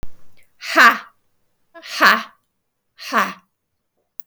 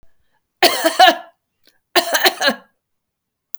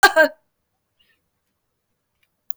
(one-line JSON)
{"exhalation_length": "4.3 s", "exhalation_amplitude": 32768, "exhalation_signal_mean_std_ratio": 0.33, "three_cough_length": "3.6 s", "three_cough_amplitude": 32768, "three_cough_signal_mean_std_ratio": 0.37, "cough_length": "2.6 s", "cough_amplitude": 32766, "cough_signal_mean_std_ratio": 0.22, "survey_phase": "beta (2021-08-13 to 2022-03-07)", "age": "65+", "gender": "Female", "wearing_mask": "No", "symptom_none": true, "smoker_status": "Ex-smoker", "respiratory_condition_asthma": false, "respiratory_condition_other": false, "recruitment_source": "REACT", "submission_delay": "3 days", "covid_test_result": "Negative", "covid_test_method": "RT-qPCR", "influenza_a_test_result": "Negative", "influenza_b_test_result": "Negative"}